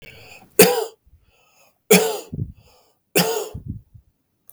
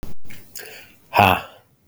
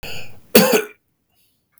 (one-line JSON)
{"three_cough_length": "4.5 s", "three_cough_amplitude": 32768, "three_cough_signal_mean_std_ratio": 0.34, "exhalation_length": "1.9 s", "exhalation_amplitude": 32766, "exhalation_signal_mean_std_ratio": 0.48, "cough_length": "1.8 s", "cough_amplitude": 32768, "cough_signal_mean_std_ratio": 0.4, "survey_phase": "beta (2021-08-13 to 2022-03-07)", "age": "18-44", "gender": "Male", "wearing_mask": "No", "symptom_none": true, "symptom_onset": "12 days", "smoker_status": "Never smoked", "respiratory_condition_asthma": false, "respiratory_condition_other": false, "recruitment_source": "REACT", "submission_delay": "3 days", "covid_test_result": "Negative", "covid_test_method": "RT-qPCR", "influenza_a_test_result": "Unknown/Void", "influenza_b_test_result": "Unknown/Void"}